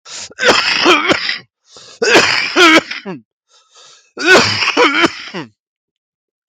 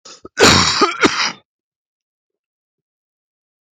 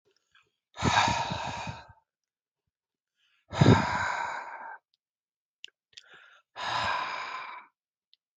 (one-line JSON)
{"three_cough_length": "6.5 s", "three_cough_amplitude": 32768, "three_cough_signal_mean_std_ratio": 0.56, "cough_length": "3.8 s", "cough_amplitude": 32768, "cough_signal_mean_std_ratio": 0.36, "exhalation_length": "8.4 s", "exhalation_amplitude": 16044, "exhalation_signal_mean_std_ratio": 0.39, "survey_phase": "alpha (2021-03-01 to 2021-08-12)", "age": "18-44", "gender": "Male", "wearing_mask": "No", "symptom_none": true, "smoker_status": "Current smoker (11 or more cigarettes per day)", "respiratory_condition_asthma": false, "respiratory_condition_other": false, "recruitment_source": "REACT", "submission_delay": "2 days", "covid_test_result": "Negative", "covid_test_method": "RT-qPCR"}